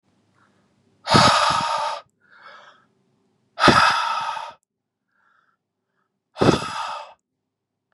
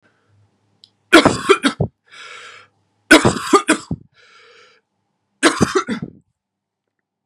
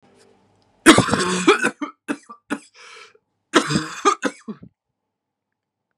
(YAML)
exhalation_length: 7.9 s
exhalation_amplitude: 31885
exhalation_signal_mean_std_ratio: 0.39
three_cough_length: 7.3 s
three_cough_amplitude: 32768
three_cough_signal_mean_std_ratio: 0.32
cough_length: 6.0 s
cough_amplitude: 32768
cough_signal_mean_std_ratio: 0.34
survey_phase: beta (2021-08-13 to 2022-03-07)
age: 18-44
gender: Male
wearing_mask: 'No'
symptom_cough_any: true
symptom_shortness_of_breath: true
symptom_sore_throat: true
symptom_abdominal_pain: true
symptom_fatigue: true
symptom_headache: true
symptom_onset: 4 days
smoker_status: Never smoked
respiratory_condition_asthma: false
respiratory_condition_other: false
recruitment_source: Test and Trace
submission_delay: 2 days
covid_test_result: Positive
covid_test_method: RT-qPCR
covid_ct_value: 30.5
covid_ct_gene: N gene